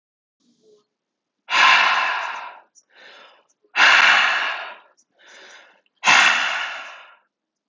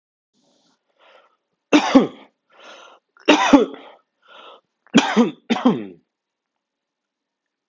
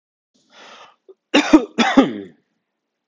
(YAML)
exhalation_length: 7.7 s
exhalation_amplitude: 30352
exhalation_signal_mean_std_ratio: 0.45
three_cough_length: 7.7 s
three_cough_amplitude: 32768
three_cough_signal_mean_std_ratio: 0.31
cough_length: 3.1 s
cough_amplitude: 32768
cough_signal_mean_std_ratio: 0.33
survey_phase: alpha (2021-03-01 to 2021-08-12)
age: 18-44
gender: Male
wearing_mask: 'No'
symptom_none: true
smoker_status: Current smoker (1 to 10 cigarettes per day)
respiratory_condition_asthma: true
respiratory_condition_other: false
recruitment_source: REACT
submission_delay: 1 day
covid_test_result: Negative
covid_test_method: RT-qPCR